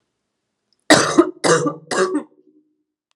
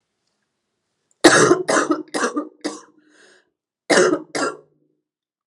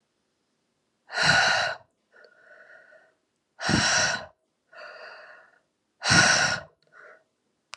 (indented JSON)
{
  "three_cough_length": "3.2 s",
  "three_cough_amplitude": 32768,
  "three_cough_signal_mean_std_ratio": 0.41,
  "cough_length": "5.5 s",
  "cough_amplitude": 32768,
  "cough_signal_mean_std_ratio": 0.39,
  "exhalation_length": "7.8 s",
  "exhalation_amplitude": 18102,
  "exhalation_signal_mean_std_ratio": 0.4,
  "survey_phase": "alpha (2021-03-01 to 2021-08-12)",
  "age": "18-44",
  "gender": "Female",
  "wearing_mask": "No",
  "symptom_new_continuous_cough": true,
  "symptom_shortness_of_breath": true,
  "symptom_fatigue": true,
  "symptom_fever_high_temperature": true,
  "symptom_headache": true,
  "symptom_change_to_sense_of_smell_or_taste": true,
  "symptom_loss_of_taste": true,
  "symptom_onset": "3 days",
  "smoker_status": "Ex-smoker",
  "respiratory_condition_asthma": false,
  "respiratory_condition_other": false,
  "recruitment_source": "Test and Trace",
  "submission_delay": "1 day",
  "covid_test_result": "Positive",
  "covid_test_method": "RT-qPCR",
  "covid_ct_value": 20.7,
  "covid_ct_gene": "ORF1ab gene",
  "covid_ct_mean": 21.3,
  "covid_viral_load": "100000 copies/ml",
  "covid_viral_load_category": "Low viral load (10K-1M copies/ml)"
}